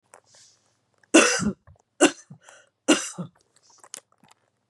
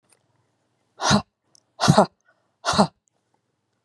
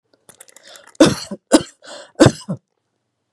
three_cough_length: 4.7 s
three_cough_amplitude: 27958
three_cough_signal_mean_std_ratio: 0.28
exhalation_length: 3.8 s
exhalation_amplitude: 29982
exhalation_signal_mean_std_ratio: 0.29
cough_length: 3.3 s
cough_amplitude: 32768
cough_signal_mean_std_ratio: 0.28
survey_phase: beta (2021-08-13 to 2022-03-07)
age: 45-64
gender: Female
wearing_mask: 'No'
symptom_none: true
smoker_status: Never smoked
respiratory_condition_asthma: false
respiratory_condition_other: false
recruitment_source: REACT
submission_delay: 1 day
covid_test_result: Negative
covid_test_method: RT-qPCR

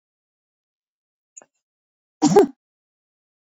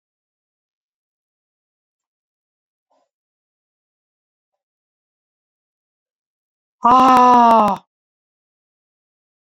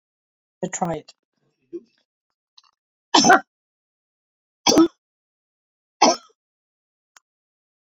cough_length: 3.4 s
cough_amplitude: 26308
cough_signal_mean_std_ratio: 0.21
exhalation_length: 9.6 s
exhalation_amplitude: 28502
exhalation_signal_mean_std_ratio: 0.24
three_cough_length: 7.9 s
three_cough_amplitude: 27975
three_cough_signal_mean_std_ratio: 0.24
survey_phase: beta (2021-08-13 to 2022-03-07)
age: 65+
gender: Female
wearing_mask: 'No'
symptom_none: true
smoker_status: Never smoked
respiratory_condition_asthma: false
respiratory_condition_other: false
recruitment_source: REACT
submission_delay: 1 day
covid_test_result: Negative
covid_test_method: RT-qPCR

